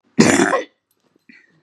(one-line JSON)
{"cough_length": "1.6 s", "cough_amplitude": 32768, "cough_signal_mean_std_ratio": 0.4, "survey_phase": "beta (2021-08-13 to 2022-03-07)", "age": "65+", "gender": "Female", "wearing_mask": "No", "symptom_cough_any": true, "symptom_sore_throat": true, "symptom_diarrhoea": true, "symptom_fatigue": true, "symptom_headache": true, "symptom_onset": "3 days", "smoker_status": "Never smoked", "respiratory_condition_asthma": false, "respiratory_condition_other": false, "recruitment_source": "Test and Trace", "submission_delay": "0 days", "covid_test_result": "Positive", "covid_test_method": "RT-qPCR", "covid_ct_value": 22.2, "covid_ct_gene": "ORF1ab gene", "covid_ct_mean": 22.6, "covid_viral_load": "38000 copies/ml", "covid_viral_load_category": "Low viral load (10K-1M copies/ml)"}